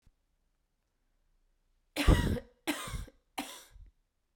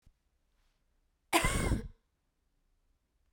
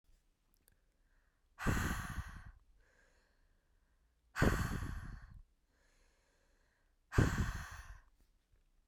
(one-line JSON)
{"three_cough_length": "4.4 s", "three_cough_amplitude": 8651, "three_cough_signal_mean_std_ratio": 0.29, "cough_length": "3.3 s", "cough_amplitude": 6443, "cough_signal_mean_std_ratio": 0.31, "exhalation_length": "8.9 s", "exhalation_amplitude": 6097, "exhalation_signal_mean_std_ratio": 0.36, "survey_phase": "beta (2021-08-13 to 2022-03-07)", "age": "18-44", "gender": "Female", "wearing_mask": "No", "symptom_cough_any": true, "symptom_runny_or_blocked_nose": true, "symptom_fatigue": true, "symptom_headache": true, "symptom_change_to_sense_of_smell_or_taste": true, "symptom_other": true, "symptom_onset": "3 days", "smoker_status": "Never smoked", "respiratory_condition_asthma": true, "respiratory_condition_other": false, "recruitment_source": "Test and Trace", "submission_delay": "2 days", "covid_test_result": "Positive", "covid_test_method": "RT-qPCR"}